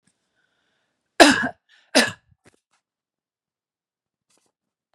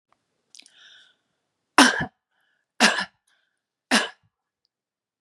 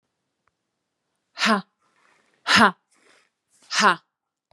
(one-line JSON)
{"cough_length": "4.9 s", "cough_amplitude": 32768, "cough_signal_mean_std_ratio": 0.2, "three_cough_length": "5.2 s", "three_cough_amplitude": 32412, "three_cough_signal_mean_std_ratio": 0.24, "exhalation_length": "4.5 s", "exhalation_amplitude": 27284, "exhalation_signal_mean_std_ratio": 0.28, "survey_phase": "beta (2021-08-13 to 2022-03-07)", "age": "45-64", "gender": "Female", "wearing_mask": "No", "symptom_none": true, "smoker_status": "Ex-smoker", "respiratory_condition_asthma": false, "respiratory_condition_other": false, "recruitment_source": "REACT", "submission_delay": "1 day", "covid_test_result": "Negative", "covid_test_method": "RT-qPCR", "influenza_a_test_result": "Negative", "influenza_b_test_result": "Negative"}